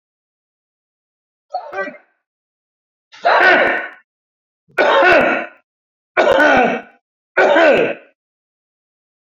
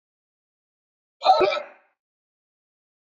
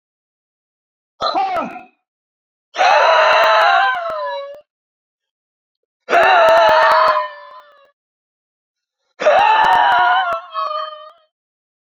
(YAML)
three_cough_length: 9.2 s
three_cough_amplitude: 28604
three_cough_signal_mean_std_ratio: 0.45
cough_length: 3.1 s
cough_amplitude: 17249
cough_signal_mean_std_ratio: 0.27
exhalation_length: 11.9 s
exhalation_amplitude: 28267
exhalation_signal_mean_std_ratio: 0.56
survey_phase: beta (2021-08-13 to 2022-03-07)
age: 45-64
gender: Male
wearing_mask: 'No'
symptom_cough_any: true
symptom_fatigue: true
smoker_status: Ex-smoker
respiratory_condition_asthma: false
respiratory_condition_other: false
recruitment_source: Test and Trace
submission_delay: -1 day
covid_test_result: Negative
covid_test_method: LFT